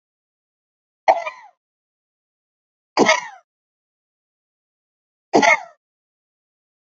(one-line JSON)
{"three_cough_length": "6.9 s", "three_cough_amplitude": 30157, "three_cough_signal_mean_std_ratio": 0.23, "survey_phase": "beta (2021-08-13 to 2022-03-07)", "age": "45-64", "gender": "Female", "wearing_mask": "No", "symptom_none": true, "symptom_onset": "12 days", "smoker_status": "Never smoked", "respiratory_condition_asthma": true, "respiratory_condition_other": false, "recruitment_source": "REACT", "submission_delay": "1 day", "covid_test_result": "Negative", "covid_test_method": "RT-qPCR", "influenza_a_test_result": "Unknown/Void", "influenza_b_test_result": "Unknown/Void"}